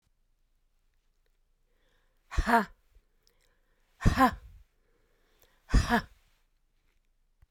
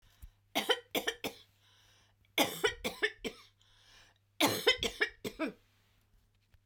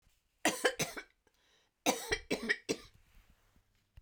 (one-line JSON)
{"exhalation_length": "7.5 s", "exhalation_amplitude": 12796, "exhalation_signal_mean_std_ratio": 0.26, "three_cough_length": "6.7 s", "three_cough_amplitude": 7274, "three_cough_signal_mean_std_ratio": 0.37, "cough_length": "4.0 s", "cough_amplitude": 6292, "cough_signal_mean_std_ratio": 0.36, "survey_phase": "beta (2021-08-13 to 2022-03-07)", "age": "65+", "gender": "Female", "wearing_mask": "No", "symptom_runny_or_blocked_nose": true, "symptom_shortness_of_breath": true, "symptom_fatigue": true, "smoker_status": "Ex-smoker", "respiratory_condition_asthma": false, "respiratory_condition_other": true, "recruitment_source": "REACT", "submission_delay": "2 days", "covid_test_result": "Negative", "covid_test_method": "RT-qPCR", "influenza_a_test_result": "Negative", "influenza_b_test_result": "Negative"}